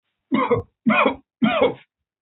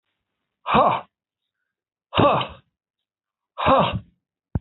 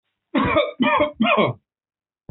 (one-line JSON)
{"three_cough_length": "2.2 s", "three_cough_amplitude": 19922, "three_cough_signal_mean_std_ratio": 0.55, "exhalation_length": "4.6 s", "exhalation_amplitude": 24756, "exhalation_signal_mean_std_ratio": 0.38, "cough_length": "2.3 s", "cough_amplitude": 19714, "cough_signal_mean_std_ratio": 0.59, "survey_phase": "alpha (2021-03-01 to 2021-08-12)", "age": "45-64", "gender": "Male", "wearing_mask": "No", "symptom_cough_any": true, "symptom_headache": true, "smoker_status": "Never smoked", "respiratory_condition_asthma": false, "respiratory_condition_other": false, "recruitment_source": "REACT", "submission_delay": "2 days", "covid_test_result": "Negative", "covid_test_method": "RT-qPCR"}